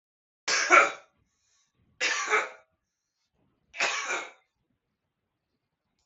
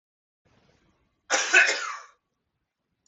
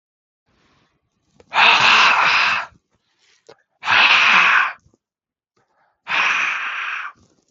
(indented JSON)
{
  "three_cough_length": "6.1 s",
  "three_cough_amplitude": 20527,
  "three_cough_signal_mean_std_ratio": 0.32,
  "cough_length": "3.1 s",
  "cough_amplitude": 17962,
  "cough_signal_mean_std_ratio": 0.31,
  "exhalation_length": "7.5 s",
  "exhalation_amplitude": 32766,
  "exhalation_signal_mean_std_ratio": 0.51,
  "survey_phase": "beta (2021-08-13 to 2022-03-07)",
  "age": "18-44",
  "gender": "Male",
  "wearing_mask": "Yes",
  "symptom_cough_any": true,
  "symptom_runny_or_blocked_nose": true,
  "symptom_fatigue": true,
  "smoker_status": "Ex-smoker",
  "respiratory_condition_asthma": false,
  "respiratory_condition_other": false,
  "recruitment_source": "Test and Trace",
  "submission_delay": "2 days",
  "covid_test_result": "Positive",
  "covid_test_method": "RT-qPCR",
  "covid_ct_value": 17.1,
  "covid_ct_gene": "N gene",
  "covid_ct_mean": 17.1,
  "covid_viral_load": "2400000 copies/ml",
  "covid_viral_load_category": "High viral load (>1M copies/ml)"
}